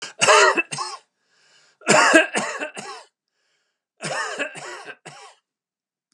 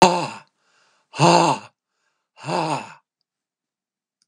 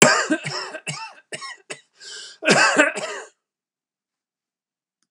three_cough_length: 6.1 s
three_cough_amplitude: 32768
three_cough_signal_mean_std_ratio: 0.39
exhalation_length: 4.3 s
exhalation_amplitude: 32768
exhalation_signal_mean_std_ratio: 0.34
cough_length: 5.1 s
cough_amplitude: 32768
cough_signal_mean_std_ratio: 0.39
survey_phase: beta (2021-08-13 to 2022-03-07)
age: 65+
gender: Male
wearing_mask: 'No'
symptom_none: true
smoker_status: Never smoked
respiratory_condition_asthma: false
respiratory_condition_other: false
recruitment_source: REACT
submission_delay: 3 days
covid_test_result: Negative
covid_test_method: RT-qPCR
influenza_a_test_result: Negative
influenza_b_test_result: Negative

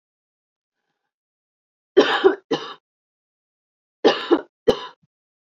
cough_length: 5.5 s
cough_amplitude: 27403
cough_signal_mean_std_ratio: 0.28
survey_phase: beta (2021-08-13 to 2022-03-07)
age: 45-64
gender: Female
wearing_mask: 'Yes'
symptom_cough_any: true
symptom_runny_or_blocked_nose: true
symptom_headache: true
symptom_change_to_sense_of_smell_or_taste: true
symptom_loss_of_taste: true
symptom_onset: 9 days
smoker_status: Current smoker (1 to 10 cigarettes per day)
respiratory_condition_asthma: false
respiratory_condition_other: false
recruitment_source: Test and Trace
submission_delay: 2 days
covid_test_result: Positive
covid_test_method: RT-qPCR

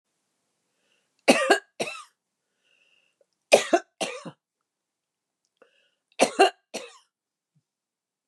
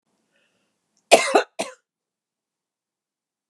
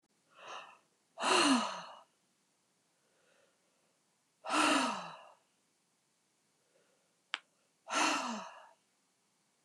three_cough_length: 8.3 s
three_cough_amplitude: 27749
three_cough_signal_mean_std_ratio: 0.23
cough_length: 3.5 s
cough_amplitude: 32768
cough_signal_mean_std_ratio: 0.2
exhalation_length: 9.6 s
exhalation_amplitude: 6592
exhalation_signal_mean_std_ratio: 0.35
survey_phase: beta (2021-08-13 to 2022-03-07)
age: 65+
gender: Female
wearing_mask: 'No'
symptom_shortness_of_breath: true
symptom_abdominal_pain: true
symptom_fatigue: true
smoker_status: Ex-smoker
respiratory_condition_asthma: true
respiratory_condition_other: false
recruitment_source: REACT
submission_delay: 1 day
covid_test_result: Negative
covid_test_method: RT-qPCR
influenza_a_test_result: Negative
influenza_b_test_result: Negative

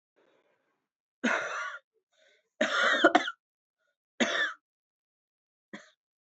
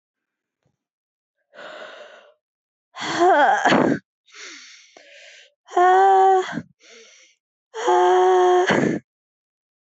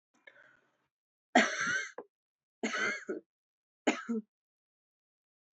cough_length: 6.4 s
cough_amplitude: 14364
cough_signal_mean_std_ratio: 0.34
exhalation_length: 9.9 s
exhalation_amplitude: 22350
exhalation_signal_mean_std_ratio: 0.48
three_cough_length: 5.5 s
three_cough_amplitude: 10171
three_cough_signal_mean_std_ratio: 0.34
survey_phase: alpha (2021-03-01 to 2021-08-12)
age: 18-44
gender: Female
wearing_mask: 'No'
symptom_fever_high_temperature: true
symptom_change_to_sense_of_smell_or_taste: true
symptom_onset: 3 days
smoker_status: Never smoked
respiratory_condition_asthma: false
respiratory_condition_other: false
recruitment_source: Test and Trace
submission_delay: 2 days
covid_test_result: Positive
covid_test_method: RT-qPCR
covid_ct_value: 16.4
covid_ct_gene: N gene
covid_ct_mean: 17.3
covid_viral_load: 2100000 copies/ml
covid_viral_load_category: High viral load (>1M copies/ml)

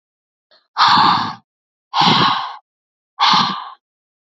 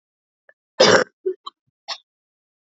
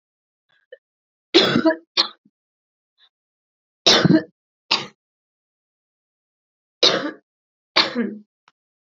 exhalation_length: 4.3 s
exhalation_amplitude: 29460
exhalation_signal_mean_std_ratio: 0.5
cough_length: 2.6 s
cough_amplitude: 30019
cough_signal_mean_std_ratio: 0.27
three_cough_length: 9.0 s
three_cough_amplitude: 32767
three_cough_signal_mean_std_ratio: 0.3
survey_phase: beta (2021-08-13 to 2022-03-07)
age: 18-44
gender: Female
wearing_mask: 'No'
symptom_cough_any: true
symptom_new_continuous_cough: true
symptom_runny_or_blocked_nose: true
symptom_fatigue: true
symptom_headache: true
smoker_status: Current smoker (e-cigarettes or vapes only)
respiratory_condition_asthma: false
respiratory_condition_other: false
recruitment_source: Test and Trace
submission_delay: 1 day
covid_test_result: Positive
covid_test_method: LFT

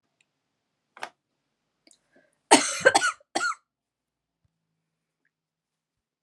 cough_length: 6.2 s
cough_amplitude: 30230
cough_signal_mean_std_ratio: 0.22
survey_phase: alpha (2021-03-01 to 2021-08-12)
age: 18-44
gender: Female
wearing_mask: 'No'
symptom_diarrhoea: true
smoker_status: Never smoked
respiratory_condition_asthma: false
respiratory_condition_other: false
recruitment_source: REACT
submission_delay: 1 day
covid_test_result: Negative
covid_test_method: RT-qPCR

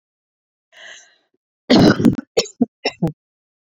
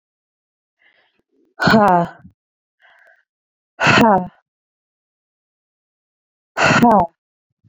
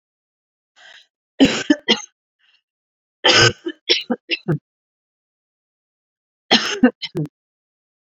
cough_length: 3.8 s
cough_amplitude: 32767
cough_signal_mean_std_ratio: 0.33
exhalation_length: 7.7 s
exhalation_amplitude: 31932
exhalation_signal_mean_std_ratio: 0.33
three_cough_length: 8.0 s
three_cough_amplitude: 32594
three_cough_signal_mean_std_ratio: 0.31
survey_phase: beta (2021-08-13 to 2022-03-07)
age: 18-44
gender: Female
wearing_mask: 'No'
symptom_cough_any: true
symptom_runny_or_blocked_nose: true
symptom_onset: 7 days
smoker_status: Never smoked
respiratory_condition_asthma: false
respiratory_condition_other: false
recruitment_source: REACT
submission_delay: 1 day
covid_test_result: Negative
covid_test_method: RT-qPCR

